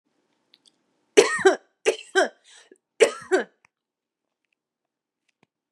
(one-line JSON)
{"three_cough_length": "5.7 s", "three_cough_amplitude": 31169, "three_cough_signal_mean_std_ratio": 0.26, "survey_phase": "beta (2021-08-13 to 2022-03-07)", "age": "18-44", "gender": "Female", "wearing_mask": "No", "symptom_none": true, "smoker_status": "Current smoker (1 to 10 cigarettes per day)", "respiratory_condition_asthma": false, "respiratory_condition_other": false, "recruitment_source": "REACT", "submission_delay": "2 days", "covid_test_result": "Negative", "covid_test_method": "RT-qPCR", "influenza_a_test_result": "Negative", "influenza_b_test_result": "Negative"}